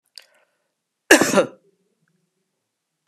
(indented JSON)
{
  "cough_length": "3.1 s",
  "cough_amplitude": 32768,
  "cough_signal_mean_std_ratio": 0.23,
  "survey_phase": "beta (2021-08-13 to 2022-03-07)",
  "age": "45-64",
  "gender": "Female",
  "wearing_mask": "No",
  "symptom_cough_any": true,
  "symptom_runny_or_blocked_nose": true,
  "symptom_abdominal_pain": true,
  "symptom_fatigue": true,
  "symptom_headache": true,
  "symptom_change_to_sense_of_smell_or_taste": true,
  "smoker_status": "Never smoked",
  "respiratory_condition_asthma": false,
  "respiratory_condition_other": false,
  "recruitment_source": "Test and Trace",
  "submission_delay": "2 days",
  "covid_test_result": "Positive",
  "covid_test_method": "RT-qPCR",
  "covid_ct_value": 19.1,
  "covid_ct_gene": "ORF1ab gene",
  "covid_ct_mean": 20.0,
  "covid_viral_load": "280000 copies/ml",
  "covid_viral_load_category": "Low viral load (10K-1M copies/ml)"
}